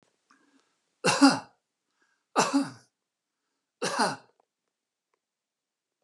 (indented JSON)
{
  "three_cough_length": "6.0 s",
  "three_cough_amplitude": 15291,
  "three_cough_signal_mean_std_ratio": 0.28,
  "survey_phase": "beta (2021-08-13 to 2022-03-07)",
  "age": "65+",
  "gender": "Male",
  "wearing_mask": "No",
  "symptom_none": true,
  "smoker_status": "Ex-smoker",
  "respiratory_condition_asthma": false,
  "respiratory_condition_other": false,
  "recruitment_source": "REACT",
  "submission_delay": "1 day",
  "covid_test_result": "Negative",
  "covid_test_method": "RT-qPCR",
  "influenza_a_test_result": "Negative",
  "influenza_b_test_result": "Negative"
}